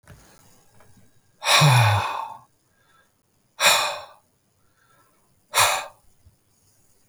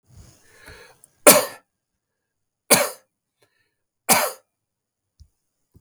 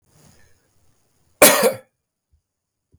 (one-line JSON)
{"exhalation_length": "7.1 s", "exhalation_amplitude": 28036, "exhalation_signal_mean_std_ratio": 0.37, "three_cough_length": "5.8 s", "three_cough_amplitude": 32768, "three_cough_signal_mean_std_ratio": 0.23, "cough_length": "3.0 s", "cough_amplitude": 32768, "cough_signal_mean_std_ratio": 0.25, "survey_phase": "beta (2021-08-13 to 2022-03-07)", "age": "45-64", "gender": "Male", "wearing_mask": "No", "symptom_none": true, "smoker_status": "Never smoked", "respiratory_condition_asthma": false, "respiratory_condition_other": false, "recruitment_source": "REACT", "submission_delay": "2 days", "covid_test_result": "Negative", "covid_test_method": "RT-qPCR", "influenza_a_test_result": "Negative", "influenza_b_test_result": "Negative"}